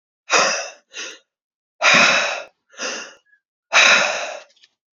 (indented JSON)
{
  "exhalation_length": "4.9 s",
  "exhalation_amplitude": 30920,
  "exhalation_signal_mean_std_ratio": 0.46,
  "survey_phase": "alpha (2021-03-01 to 2021-08-12)",
  "age": "18-44",
  "gender": "Female",
  "wearing_mask": "No",
  "symptom_cough_any": true,
  "symptom_new_continuous_cough": true,
  "symptom_shortness_of_breath": true,
  "symptom_fatigue": true,
  "symptom_fever_high_temperature": true,
  "symptom_headache": true,
  "symptom_change_to_sense_of_smell_or_taste": true,
  "symptom_loss_of_taste": true,
  "symptom_onset": "5 days",
  "smoker_status": "Never smoked",
  "respiratory_condition_asthma": false,
  "respiratory_condition_other": false,
  "recruitment_source": "Test and Trace",
  "submission_delay": "3 days",
  "covid_test_result": "Positive",
  "covid_test_method": "RT-qPCR",
  "covid_ct_value": 16.0,
  "covid_ct_gene": "ORF1ab gene",
  "covid_ct_mean": 16.7,
  "covid_viral_load": "3400000 copies/ml",
  "covid_viral_load_category": "High viral load (>1M copies/ml)"
}